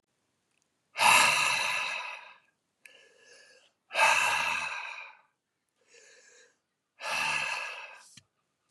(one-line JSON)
{"exhalation_length": "8.7 s", "exhalation_amplitude": 12194, "exhalation_signal_mean_std_ratio": 0.44, "survey_phase": "beta (2021-08-13 to 2022-03-07)", "age": "45-64", "gender": "Male", "wearing_mask": "No", "symptom_cough_any": true, "symptom_runny_or_blocked_nose": true, "symptom_other": true, "symptom_onset": "5 days", "smoker_status": "Never smoked", "respiratory_condition_asthma": true, "respiratory_condition_other": false, "recruitment_source": "Test and Trace", "submission_delay": "1 day", "covid_test_result": "Negative", "covid_test_method": "RT-qPCR"}